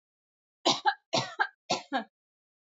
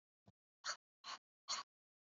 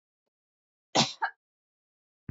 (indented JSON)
{
  "three_cough_length": "2.6 s",
  "three_cough_amplitude": 9175,
  "three_cough_signal_mean_std_ratio": 0.37,
  "exhalation_length": "2.1 s",
  "exhalation_amplitude": 939,
  "exhalation_signal_mean_std_ratio": 0.31,
  "cough_length": "2.3 s",
  "cough_amplitude": 11620,
  "cough_signal_mean_std_ratio": 0.23,
  "survey_phase": "beta (2021-08-13 to 2022-03-07)",
  "age": "18-44",
  "gender": "Female",
  "wearing_mask": "No",
  "symptom_none": true,
  "symptom_onset": "2 days",
  "smoker_status": "Never smoked",
  "respiratory_condition_asthma": false,
  "respiratory_condition_other": false,
  "recruitment_source": "REACT",
  "submission_delay": "1 day",
  "covid_test_result": "Negative",
  "covid_test_method": "RT-qPCR",
  "influenza_a_test_result": "Negative",
  "influenza_b_test_result": "Negative"
}